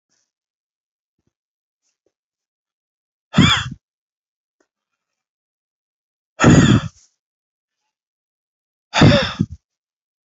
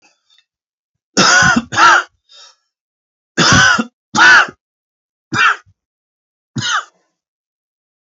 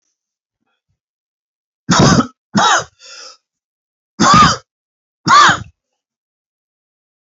{"exhalation_length": "10.2 s", "exhalation_amplitude": 28055, "exhalation_signal_mean_std_ratio": 0.26, "three_cough_length": "8.0 s", "three_cough_amplitude": 32768, "three_cough_signal_mean_std_ratio": 0.41, "cough_length": "7.3 s", "cough_amplitude": 31704, "cough_signal_mean_std_ratio": 0.36, "survey_phase": "beta (2021-08-13 to 2022-03-07)", "age": "18-44", "gender": "Male", "wearing_mask": "No", "symptom_cough_any": true, "symptom_runny_or_blocked_nose": true, "symptom_headache": true, "symptom_change_to_sense_of_smell_or_taste": true, "symptom_loss_of_taste": true, "symptom_onset": "3 days", "smoker_status": "Current smoker (e-cigarettes or vapes only)", "respiratory_condition_asthma": false, "respiratory_condition_other": false, "recruitment_source": "Test and Trace", "submission_delay": "1 day", "covid_test_result": "Positive", "covid_test_method": "RT-qPCR", "covid_ct_value": 13.2, "covid_ct_gene": "ORF1ab gene", "covid_ct_mean": 13.6, "covid_viral_load": "34000000 copies/ml", "covid_viral_load_category": "High viral load (>1M copies/ml)"}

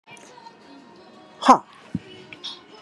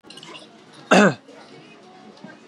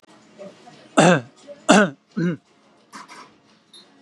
{"exhalation_length": "2.8 s", "exhalation_amplitude": 32767, "exhalation_signal_mean_std_ratio": 0.23, "cough_length": "2.5 s", "cough_amplitude": 30605, "cough_signal_mean_std_ratio": 0.3, "three_cough_length": "4.0 s", "three_cough_amplitude": 32767, "three_cough_signal_mean_std_ratio": 0.32, "survey_phase": "beta (2021-08-13 to 2022-03-07)", "age": "18-44", "gender": "Male", "wearing_mask": "Yes", "symptom_none": true, "smoker_status": "Current smoker (1 to 10 cigarettes per day)", "respiratory_condition_asthma": false, "respiratory_condition_other": false, "recruitment_source": "REACT", "submission_delay": "1 day", "covid_test_result": "Negative", "covid_test_method": "RT-qPCR"}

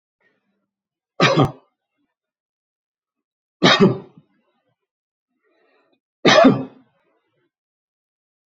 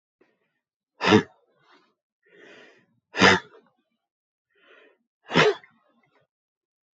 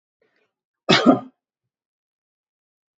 {"three_cough_length": "8.5 s", "three_cough_amplitude": 32768, "three_cough_signal_mean_std_ratio": 0.26, "exhalation_length": "7.0 s", "exhalation_amplitude": 22970, "exhalation_signal_mean_std_ratio": 0.24, "cough_length": "3.0 s", "cough_amplitude": 28132, "cough_signal_mean_std_ratio": 0.23, "survey_phase": "beta (2021-08-13 to 2022-03-07)", "age": "65+", "gender": "Male", "wearing_mask": "No", "symptom_none": true, "smoker_status": "Never smoked", "respiratory_condition_asthma": false, "respiratory_condition_other": false, "recruitment_source": "REACT", "submission_delay": "1 day", "covid_test_result": "Negative", "covid_test_method": "RT-qPCR"}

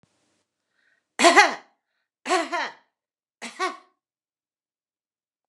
{"three_cough_length": "5.5 s", "three_cough_amplitude": 29203, "three_cough_signal_mean_std_ratio": 0.26, "survey_phase": "beta (2021-08-13 to 2022-03-07)", "age": "45-64", "gender": "Female", "wearing_mask": "No", "symptom_none": true, "smoker_status": "Ex-smoker", "respiratory_condition_asthma": false, "respiratory_condition_other": false, "recruitment_source": "REACT", "submission_delay": "1 day", "covid_test_result": "Negative", "covid_test_method": "RT-qPCR", "influenza_a_test_result": "Negative", "influenza_b_test_result": "Negative"}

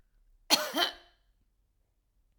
{"cough_length": "2.4 s", "cough_amplitude": 11627, "cough_signal_mean_std_ratio": 0.28, "survey_phase": "alpha (2021-03-01 to 2021-08-12)", "age": "45-64", "gender": "Female", "wearing_mask": "No", "symptom_none": true, "smoker_status": "Never smoked", "respiratory_condition_asthma": false, "respiratory_condition_other": false, "recruitment_source": "REACT", "submission_delay": "2 days", "covid_test_result": "Negative", "covid_test_method": "RT-qPCR"}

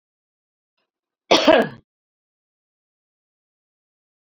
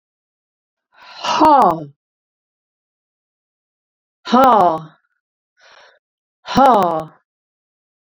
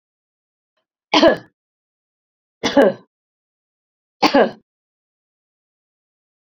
{"cough_length": "4.4 s", "cough_amplitude": 30077, "cough_signal_mean_std_ratio": 0.21, "exhalation_length": "8.0 s", "exhalation_amplitude": 28952, "exhalation_signal_mean_std_ratio": 0.34, "three_cough_length": "6.5 s", "three_cough_amplitude": 32767, "three_cough_signal_mean_std_ratio": 0.25, "survey_phase": "beta (2021-08-13 to 2022-03-07)", "age": "65+", "gender": "Female", "wearing_mask": "No", "symptom_none": true, "smoker_status": "Ex-smoker", "respiratory_condition_asthma": false, "respiratory_condition_other": false, "recruitment_source": "REACT", "submission_delay": "1 day", "covid_test_result": "Negative", "covid_test_method": "RT-qPCR"}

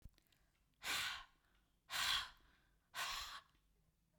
{"exhalation_length": "4.2 s", "exhalation_amplitude": 1700, "exhalation_signal_mean_std_ratio": 0.45, "survey_phase": "beta (2021-08-13 to 2022-03-07)", "age": "45-64", "gender": "Female", "wearing_mask": "No", "symptom_runny_or_blocked_nose": true, "symptom_onset": "5 days", "smoker_status": "Never smoked", "respiratory_condition_asthma": false, "respiratory_condition_other": false, "recruitment_source": "REACT", "submission_delay": "3 days", "covid_test_result": "Negative", "covid_test_method": "RT-qPCR", "influenza_a_test_result": "Negative", "influenza_b_test_result": "Negative"}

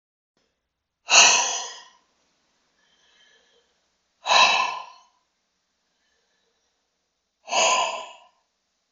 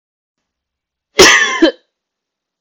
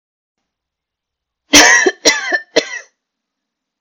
{"exhalation_length": "8.9 s", "exhalation_amplitude": 31718, "exhalation_signal_mean_std_ratio": 0.31, "cough_length": "2.6 s", "cough_amplitude": 32768, "cough_signal_mean_std_ratio": 0.35, "three_cough_length": "3.8 s", "three_cough_amplitude": 32768, "three_cough_signal_mean_std_ratio": 0.35, "survey_phase": "beta (2021-08-13 to 2022-03-07)", "age": "18-44", "gender": "Female", "wearing_mask": "No", "symptom_runny_or_blocked_nose": true, "symptom_sore_throat": true, "symptom_onset": "12 days", "smoker_status": "Never smoked", "respiratory_condition_asthma": false, "respiratory_condition_other": false, "recruitment_source": "REACT", "submission_delay": "0 days", "covid_test_result": "Negative", "covid_test_method": "RT-qPCR", "influenza_a_test_result": "Negative", "influenza_b_test_result": "Negative"}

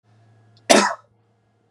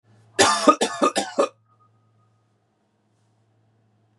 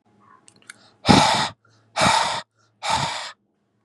{"cough_length": "1.7 s", "cough_amplitude": 32768, "cough_signal_mean_std_ratio": 0.28, "three_cough_length": "4.2 s", "three_cough_amplitude": 31073, "three_cough_signal_mean_std_ratio": 0.32, "exhalation_length": "3.8 s", "exhalation_amplitude": 32768, "exhalation_signal_mean_std_ratio": 0.44, "survey_phase": "beta (2021-08-13 to 2022-03-07)", "age": "18-44", "gender": "Male", "wearing_mask": "Yes", "symptom_none": true, "smoker_status": "Never smoked", "respiratory_condition_asthma": false, "respiratory_condition_other": false, "recruitment_source": "REACT", "submission_delay": "0 days", "covid_test_result": "Negative", "covid_test_method": "RT-qPCR", "influenza_a_test_result": "Negative", "influenza_b_test_result": "Negative"}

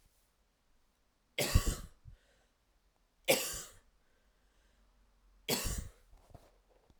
{"three_cough_length": "7.0 s", "three_cough_amplitude": 7537, "three_cough_signal_mean_std_ratio": 0.29, "survey_phase": "alpha (2021-03-01 to 2021-08-12)", "age": "18-44", "gender": "Female", "wearing_mask": "No", "symptom_none": true, "smoker_status": "Never smoked", "respiratory_condition_asthma": false, "respiratory_condition_other": false, "recruitment_source": "REACT", "submission_delay": "1 day", "covid_test_result": "Negative", "covid_test_method": "RT-qPCR"}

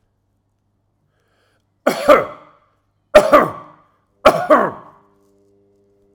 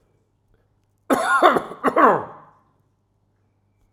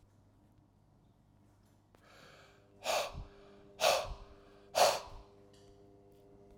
{"three_cough_length": "6.1 s", "three_cough_amplitude": 32768, "three_cough_signal_mean_std_ratio": 0.3, "cough_length": "3.9 s", "cough_amplitude": 31342, "cough_signal_mean_std_ratio": 0.37, "exhalation_length": "6.6 s", "exhalation_amplitude": 6303, "exhalation_signal_mean_std_ratio": 0.32, "survey_phase": "alpha (2021-03-01 to 2021-08-12)", "age": "45-64", "gender": "Male", "wearing_mask": "No", "symptom_none": true, "smoker_status": "Never smoked", "respiratory_condition_asthma": false, "respiratory_condition_other": false, "recruitment_source": "REACT", "submission_delay": "1 day", "covid_test_result": "Negative", "covid_test_method": "RT-qPCR"}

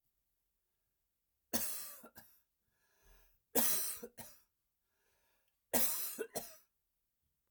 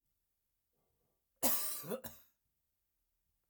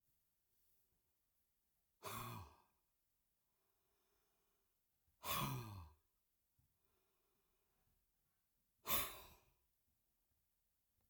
{"three_cough_length": "7.5 s", "three_cough_amplitude": 5167, "three_cough_signal_mean_std_ratio": 0.33, "cough_length": "3.5 s", "cough_amplitude": 4133, "cough_signal_mean_std_ratio": 0.3, "exhalation_length": "11.1 s", "exhalation_amplitude": 1884, "exhalation_signal_mean_std_ratio": 0.27, "survey_phase": "alpha (2021-03-01 to 2021-08-12)", "age": "45-64", "gender": "Male", "wearing_mask": "No", "symptom_none": true, "smoker_status": "Ex-smoker", "respiratory_condition_asthma": false, "respiratory_condition_other": false, "recruitment_source": "REACT", "submission_delay": "1 day", "covid_test_result": "Negative", "covid_test_method": "RT-qPCR"}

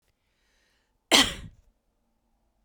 {"cough_length": "2.6 s", "cough_amplitude": 20958, "cough_signal_mean_std_ratio": 0.21, "survey_phase": "beta (2021-08-13 to 2022-03-07)", "age": "18-44", "gender": "Female", "wearing_mask": "No", "symptom_none": true, "smoker_status": "Never smoked", "respiratory_condition_asthma": true, "respiratory_condition_other": false, "recruitment_source": "Test and Trace", "submission_delay": "1 day", "covid_test_result": "Positive", "covid_test_method": "LFT"}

